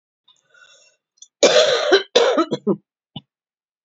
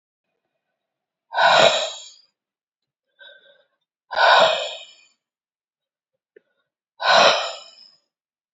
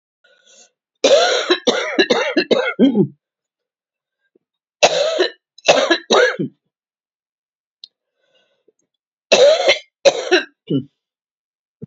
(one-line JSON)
{"cough_length": "3.8 s", "cough_amplitude": 29648, "cough_signal_mean_std_ratio": 0.42, "exhalation_length": "8.5 s", "exhalation_amplitude": 27549, "exhalation_signal_mean_std_ratio": 0.34, "three_cough_length": "11.9 s", "three_cough_amplitude": 32768, "three_cough_signal_mean_std_ratio": 0.43, "survey_phase": "beta (2021-08-13 to 2022-03-07)", "age": "65+", "gender": "Female", "wearing_mask": "No", "symptom_cough_any": true, "symptom_abdominal_pain": true, "symptom_fatigue": true, "symptom_change_to_sense_of_smell_or_taste": true, "smoker_status": "Never smoked", "respiratory_condition_asthma": false, "respiratory_condition_other": false, "recruitment_source": "Test and Trace", "submission_delay": "1 day", "covid_test_result": "Positive", "covid_test_method": "LFT"}